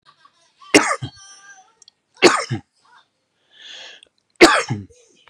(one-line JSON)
{"three_cough_length": "5.3 s", "three_cough_amplitude": 32768, "three_cough_signal_mean_std_ratio": 0.28, "survey_phase": "beta (2021-08-13 to 2022-03-07)", "age": "45-64", "gender": "Male", "wearing_mask": "No", "symptom_cough_any": true, "symptom_runny_or_blocked_nose": true, "symptom_fatigue": true, "symptom_onset": "12 days", "smoker_status": "Ex-smoker", "respiratory_condition_asthma": false, "respiratory_condition_other": false, "recruitment_source": "REACT", "submission_delay": "8 days", "covid_test_result": "Negative", "covid_test_method": "RT-qPCR", "influenza_a_test_result": "Negative", "influenza_b_test_result": "Negative"}